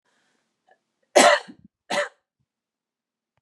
{"cough_length": "3.4 s", "cough_amplitude": 30685, "cough_signal_mean_std_ratio": 0.25, "survey_phase": "beta (2021-08-13 to 2022-03-07)", "age": "45-64", "gender": "Female", "wearing_mask": "No", "symptom_none": true, "symptom_onset": "12 days", "smoker_status": "Never smoked", "respiratory_condition_asthma": true, "respiratory_condition_other": false, "recruitment_source": "REACT", "submission_delay": "2 days", "covid_test_result": "Negative", "covid_test_method": "RT-qPCR", "influenza_a_test_result": "Negative", "influenza_b_test_result": "Negative"}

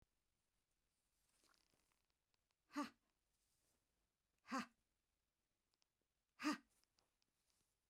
{"exhalation_length": "7.9 s", "exhalation_amplitude": 936, "exhalation_signal_mean_std_ratio": 0.2, "survey_phase": "beta (2021-08-13 to 2022-03-07)", "age": "45-64", "gender": "Female", "wearing_mask": "No", "symptom_none": true, "smoker_status": "Never smoked", "respiratory_condition_asthma": false, "respiratory_condition_other": false, "recruitment_source": "REACT", "submission_delay": "1 day", "covid_test_result": "Negative", "covid_test_method": "RT-qPCR", "influenza_a_test_result": "Negative", "influenza_b_test_result": "Negative"}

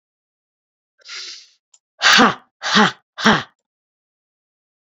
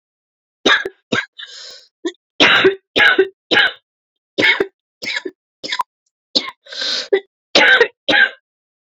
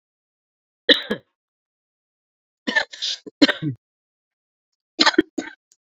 {"exhalation_length": "4.9 s", "exhalation_amplitude": 31299, "exhalation_signal_mean_std_ratio": 0.32, "three_cough_length": "8.9 s", "three_cough_amplitude": 32768, "three_cough_signal_mean_std_ratio": 0.44, "cough_length": "5.8 s", "cough_amplitude": 30076, "cough_signal_mean_std_ratio": 0.26, "survey_phase": "beta (2021-08-13 to 2022-03-07)", "age": "18-44", "gender": "Female", "wearing_mask": "No", "symptom_cough_any": true, "symptom_sore_throat": true, "symptom_fatigue": true, "symptom_headache": true, "smoker_status": "Never smoked", "respiratory_condition_asthma": true, "respiratory_condition_other": false, "recruitment_source": "Test and Trace", "submission_delay": "2 days", "covid_test_result": "Positive", "covid_test_method": "RT-qPCR", "covid_ct_value": 28.2, "covid_ct_gene": "ORF1ab gene", "covid_ct_mean": 28.7, "covid_viral_load": "390 copies/ml", "covid_viral_load_category": "Minimal viral load (< 10K copies/ml)"}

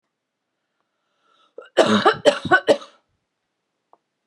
{"three_cough_length": "4.3 s", "three_cough_amplitude": 31536, "three_cough_signal_mean_std_ratio": 0.3, "survey_phase": "beta (2021-08-13 to 2022-03-07)", "age": "45-64", "gender": "Female", "wearing_mask": "No", "symptom_none": true, "smoker_status": "Ex-smoker", "respiratory_condition_asthma": false, "respiratory_condition_other": false, "recruitment_source": "REACT", "submission_delay": "1 day", "covid_test_result": "Negative", "covid_test_method": "RT-qPCR", "influenza_a_test_result": "Negative", "influenza_b_test_result": "Negative"}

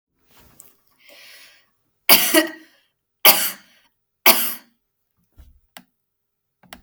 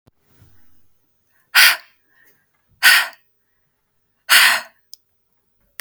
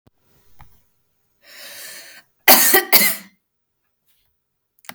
{"three_cough_length": "6.8 s", "three_cough_amplitude": 32768, "three_cough_signal_mean_std_ratio": 0.26, "exhalation_length": "5.8 s", "exhalation_amplitude": 32768, "exhalation_signal_mean_std_ratio": 0.29, "cough_length": "4.9 s", "cough_amplitude": 32768, "cough_signal_mean_std_ratio": 0.28, "survey_phase": "beta (2021-08-13 to 2022-03-07)", "age": "18-44", "gender": "Female", "wearing_mask": "No", "symptom_none": true, "smoker_status": "Never smoked", "respiratory_condition_asthma": false, "respiratory_condition_other": false, "recruitment_source": "REACT", "submission_delay": "1 day", "covid_test_result": "Negative", "covid_test_method": "RT-qPCR", "influenza_a_test_result": "Negative", "influenza_b_test_result": "Negative"}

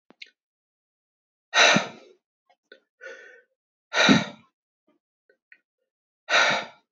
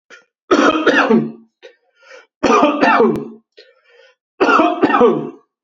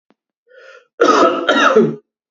{"exhalation_length": "6.9 s", "exhalation_amplitude": 20715, "exhalation_signal_mean_std_ratio": 0.3, "three_cough_length": "5.6 s", "three_cough_amplitude": 28445, "three_cough_signal_mean_std_ratio": 0.57, "cough_length": "2.3 s", "cough_amplitude": 28475, "cough_signal_mean_std_ratio": 0.54, "survey_phase": "beta (2021-08-13 to 2022-03-07)", "age": "45-64", "gender": "Male", "wearing_mask": "No", "symptom_runny_or_blocked_nose": true, "symptom_sore_throat": true, "smoker_status": "Never smoked", "respiratory_condition_asthma": false, "respiratory_condition_other": false, "recruitment_source": "REACT", "submission_delay": "0 days", "covid_test_result": "Negative", "covid_test_method": "RT-qPCR", "influenza_a_test_result": "Negative", "influenza_b_test_result": "Negative"}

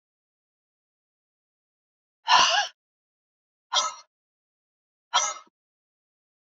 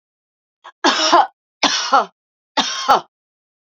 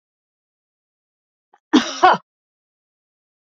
{"exhalation_length": "6.6 s", "exhalation_amplitude": 18259, "exhalation_signal_mean_std_ratio": 0.25, "three_cough_length": "3.7 s", "three_cough_amplitude": 30724, "three_cough_signal_mean_std_ratio": 0.43, "cough_length": "3.4 s", "cough_amplitude": 30889, "cough_signal_mean_std_ratio": 0.22, "survey_phase": "beta (2021-08-13 to 2022-03-07)", "age": "45-64", "gender": "Female", "wearing_mask": "No", "symptom_none": true, "smoker_status": "Never smoked", "respiratory_condition_asthma": false, "respiratory_condition_other": false, "recruitment_source": "Test and Trace", "submission_delay": "2 days", "covid_test_result": "Negative", "covid_test_method": "RT-qPCR"}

